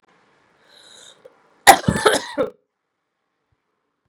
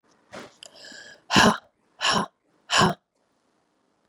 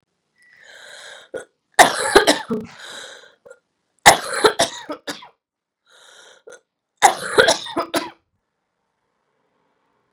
{"cough_length": "4.1 s", "cough_amplitude": 32768, "cough_signal_mean_std_ratio": 0.23, "exhalation_length": "4.1 s", "exhalation_amplitude": 25519, "exhalation_signal_mean_std_ratio": 0.33, "three_cough_length": "10.1 s", "three_cough_amplitude": 32768, "three_cough_signal_mean_std_ratio": 0.29, "survey_phase": "beta (2021-08-13 to 2022-03-07)", "age": "45-64", "gender": "Female", "wearing_mask": "No", "symptom_cough_any": true, "symptom_new_continuous_cough": true, "symptom_runny_or_blocked_nose": true, "symptom_sore_throat": true, "symptom_fatigue": true, "symptom_fever_high_temperature": true, "symptom_headache": true, "symptom_onset": "6 days", "smoker_status": "Never smoked", "respiratory_condition_asthma": false, "respiratory_condition_other": false, "recruitment_source": "Test and Trace", "submission_delay": "2 days", "covid_test_result": "Positive", "covid_test_method": "RT-qPCR", "covid_ct_value": 32.6, "covid_ct_gene": "ORF1ab gene"}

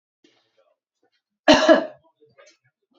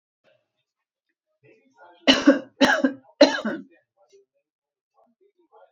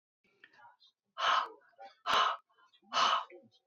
{"cough_length": "3.0 s", "cough_amplitude": 28295, "cough_signal_mean_std_ratio": 0.26, "three_cough_length": "5.7 s", "three_cough_amplitude": 28342, "three_cough_signal_mean_std_ratio": 0.27, "exhalation_length": "3.7 s", "exhalation_amplitude": 5549, "exhalation_signal_mean_std_ratio": 0.42, "survey_phase": "beta (2021-08-13 to 2022-03-07)", "age": "45-64", "gender": "Female", "wearing_mask": "No", "symptom_none": true, "smoker_status": "Ex-smoker", "respiratory_condition_asthma": false, "respiratory_condition_other": false, "recruitment_source": "REACT", "submission_delay": "2 days", "covid_test_result": "Negative", "covid_test_method": "RT-qPCR", "influenza_a_test_result": "Negative", "influenza_b_test_result": "Negative"}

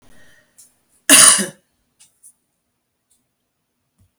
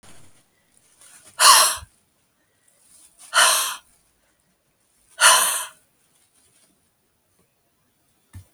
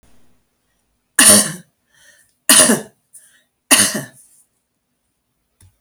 {"cough_length": "4.2 s", "cough_amplitude": 32768, "cough_signal_mean_std_ratio": 0.23, "exhalation_length": "8.5 s", "exhalation_amplitude": 32768, "exhalation_signal_mean_std_ratio": 0.29, "three_cough_length": "5.8 s", "three_cough_amplitude": 32768, "three_cough_signal_mean_std_ratio": 0.31, "survey_phase": "beta (2021-08-13 to 2022-03-07)", "age": "65+", "gender": "Female", "wearing_mask": "No", "symptom_cough_any": true, "symptom_runny_or_blocked_nose": true, "smoker_status": "Ex-smoker", "respiratory_condition_asthma": true, "respiratory_condition_other": false, "recruitment_source": "REACT", "submission_delay": "2 days", "covid_test_result": "Negative", "covid_test_method": "RT-qPCR"}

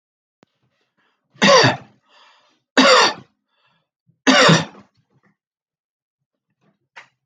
{"three_cough_length": "7.3 s", "three_cough_amplitude": 31453, "three_cough_signal_mean_std_ratio": 0.32, "survey_phase": "beta (2021-08-13 to 2022-03-07)", "age": "45-64", "gender": "Male", "wearing_mask": "No", "symptom_none": true, "smoker_status": "Ex-smoker", "respiratory_condition_asthma": false, "respiratory_condition_other": false, "recruitment_source": "REACT", "submission_delay": "2 days", "covid_test_result": "Negative", "covid_test_method": "RT-qPCR"}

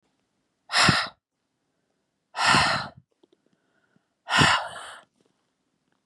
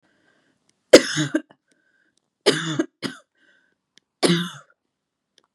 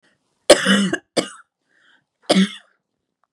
{"exhalation_length": "6.1 s", "exhalation_amplitude": 21395, "exhalation_signal_mean_std_ratio": 0.36, "three_cough_length": "5.5 s", "three_cough_amplitude": 32768, "three_cough_signal_mean_std_ratio": 0.25, "cough_length": "3.3 s", "cough_amplitude": 32768, "cough_signal_mean_std_ratio": 0.34, "survey_phase": "beta (2021-08-13 to 2022-03-07)", "age": "18-44", "gender": "Female", "wearing_mask": "No", "symptom_runny_or_blocked_nose": true, "symptom_fatigue": true, "symptom_headache": true, "smoker_status": "Never smoked", "respiratory_condition_asthma": false, "respiratory_condition_other": false, "recruitment_source": "Test and Trace", "submission_delay": "1 day", "covid_test_result": "Positive", "covid_test_method": "RT-qPCR", "covid_ct_value": 22.3, "covid_ct_gene": "N gene", "covid_ct_mean": 22.9, "covid_viral_load": "31000 copies/ml", "covid_viral_load_category": "Low viral load (10K-1M copies/ml)"}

